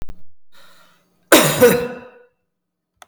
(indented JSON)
{
  "cough_length": "3.1 s",
  "cough_amplitude": 32768,
  "cough_signal_mean_std_ratio": 0.4,
  "survey_phase": "beta (2021-08-13 to 2022-03-07)",
  "age": "45-64",
  "gender": "Female",
  "wearing_mask": "No",
  "symptom_change_to_sense_of_smell_or_taste": true,
  "smoker_status": "Ex-smoker",
  "respiratory_condition_asthma": false,
  "respiratory_condition_other": false,
  "recruitment_source": "Test and Trace",
  "submission_delay": "9 days",
  "covid_test_result": "Negative",
  "covid_test_method": "RT-qPCR"
}